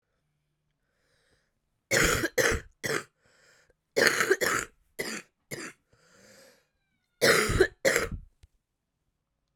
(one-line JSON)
{"cough_length": "9.6 s", "cough_amplitude": 21841, "cough_signal_mean_std_ratio": 0.38, "survey_phase": "beta (2021-08-13 to 2022-03-07)", "age": "18-44", "gender": "Female", "wearing_mask": "No", "symptom_cough_any": true, "symptom_runny_or_blocked_nose": true, "symptom_shortness_of_breath": true, "symptom_abdominal_pain": true, "symptom_fatigue": true, "symptom_headache": true, "symptom_change_to_sense_of_smell_or_taste": true, "symptom_loss_of_taste": true, "symptom_onset": "4 days", "smoker_status": "Current smoker (1 to 10 cigarettes per day)", "respiratory_condition_asthma": false, "respiratory_condition_other": false, "recruitment_source": "Test and Trace", "submission_delay": "2 days", "covid_test_result": "Positive", "covid_test_method": "RT-qPCR", "covid_ct_value": 16.2, "covid_ct_gene": "ORF1ab gene", "covid_ct_mean": 16.4, "covid_viral_load": "4000000 copies/ml", "covid_viral_load_category": "High viral load (>1M copies/ml)"}